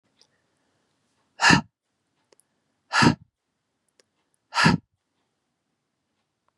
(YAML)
exhalation_length: 6.6 s
exhalation_amplitude: 26618
exhalation_signal_mean_std_ratio: 0.24
survey_phase: beta (2021-08-13 to 2022-03-07)
age: 45-64
gender: Female
wearing_mask: 'No'
symptom_none: true
smoker_status: Ex-smoker
respiratory_condition_asthma: false
respiratory_condition_other: false
recruitment_source: REACT
submission_delay: 1 day
covid_test_result: Negative
covid_test_method: RT-qPCR
influenza_a_test_result: Negative
influenza_b_test_result: Negative